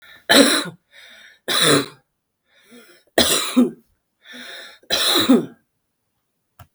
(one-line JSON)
{"cough_length": "6.7 s", "cough_amplitude": 32768, "cough_signal_mean_std_ratio": 0.42, "survey_phase": "beta (2021-08-13 to 2022-03-07)", "age": "45-64", "gender": "Female", "wearing_mask": "No", "symptom_cough_any": true, "symptom_shortness_of_breath": true, "symptom_abdominal_pain": true, "symptom_headache": true, "symptom_change_to_sense_of_smell_or_taste": true, "smoker_status": "Ex-smoker", "respiratory_condition_asthma": true, "respiratory_condition_other": true, "recruitment_source": "Test and Trace", "submission_delay": "1 day", "covid_test_result": "Positive", "covid_test_method": "RT-qPCR", "covid_ct_value": 21.1, "covid_ct_gene": "ORF1ab gene", "covid_ct_mean": 21.5, "covid_viral_load": "90000 copies/ml", "covid_viral_load_category": "Low viral load (10K-1M copies/ml)"}